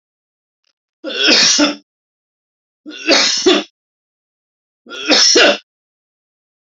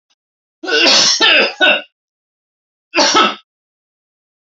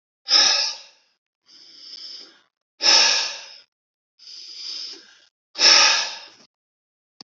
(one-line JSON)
{"three_cough_length": "6.7 s", "three_cough_amplitude": 32768, "three_cough_signal_mean_std_ratio": 0.42, "cough_length": "4.5 s", "cough_amplitude": 32767, "cough_signal_mean_std_ratio": 0.48, "exhalation_length": "7.3 s", "exhalation_amplitude": 29308, "exhalation_signal_mean_std_ratio": 0.39, "survey_phase": "alpha (2021-03-01 to 2021-08-12)", "age": "65+", "gender": "Male", "wearing_mask": "No", "symptom_none": true, "smoker_status": "Ex-smoker", "respiratory_condition_asthma": false, "respiratory_condition_other": false, "recruitment_source": "REACT", "submission_delay": "1 day", "covid_test_result": "Negative", "covid_test_method": "RT-qPCR"}